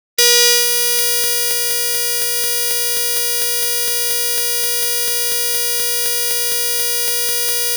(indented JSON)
{
  "three_cough_length": "7.8 s",
  "three_cough_amplitude": 32275,
  "three_cough_signal_mean_std_ratio": 1.3,
  "survey_phase": "alpha (2021-03-01 to 2021-08-12)",
  "age": "65+",
  "gender": "Female",
  "wearing_mask": "No",
  "symptom_cough_any": true,
  "symptom_fatigue": true,
  "symptom_headache": true,
  "symptom_onset": "9 days",
  "smoker_status": "Ex-smoker",
  "respiratory_condition_asthma": false,
  "respiratory_condition_other": false,
  "recruitment_source": "REACT",
  "submission_delay": "7 days",
  "covid_test_result": "Negative",
  "covid_test_method": "RT-qPCR"
}